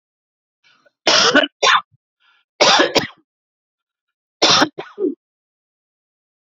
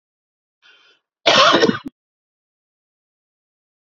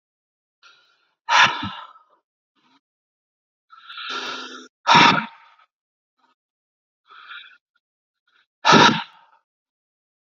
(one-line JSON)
{"three_cough_length": "6.5 s", "three_cough_amplitude": 32768, "three_cough_signal_mean_std_ratio": 0.37, "cough_length": "3.8 s", "cough_amplitude": 29983, "cough_signal_mean_std_ratio": 0.28, "exhalation_length": "10.3 s", "exhalation_amplitude": 29135, "exhalation_signal_mean_std_ratio": 0.27, "survey_phase": "beta (2021-08-13 to 2022-03-07)", "age": "45-64", "gender": "Male", "wearing_mask": "No", "symptom_none": true, "smoker_status": "Ex-smoker", "respiratory_condition_asthma": false, "respiratory_condition_other": false, "recruitment_source": "REACT", "submission_delay": "1 day", "covid_test_result": "Negative", "covid_test_method": "RT-qPCR"}